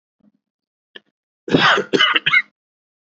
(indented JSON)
{
  "cough_length": "3.1 s",
  "cough_amplitude": 28750,
  "cough_signal_mean_std_ratio": 0.39,
  "survey_phase": "beta (2021-08-13 to 2022-03-07)",
  "age": "18-44",
  "gender": "Male",
  "wearing_mask": "No",
  "symptom_none": true,
  "smoker_status": "Never smoked",
  "respiratory_condition_asthma": false,
  "respiratory_condition_other": false,
  "recruitment_source": "REACT",
  "submission_delay": "1 day",
  "covid_test_result": "Negative",
  "covid_test_method": "RT-qPCR"
}